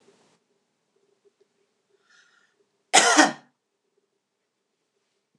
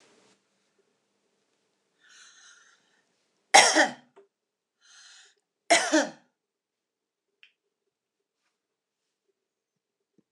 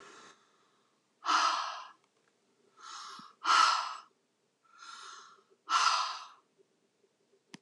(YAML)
cough_length: 5.4 s
cough_amplitude: 24936
cough_signal_mean_std_ratio: 0.2
three_cough_length: 10.3 s
three_cough_amplitude: 25424
three_cough_signal_mean_std_ratio: 0.19
exhalation_length: 7.6 s
exhalation_amplitude: 7474
exhalation_signal_mean_std_ratio: 0.38
survey_phase: beta (2021-08-13 to 2022-03-07)
age: 65+
gender: Female
wearing_mask: 'No'
symptom_none: true
smoker_status: Ex-smoker
respiratory_condition_asthma: false
respiratory_condition_other: false
recruitment_source: REACT
submission_delay: 4 days
covid_test_result: Negative
covid_test_method: RT-qPCR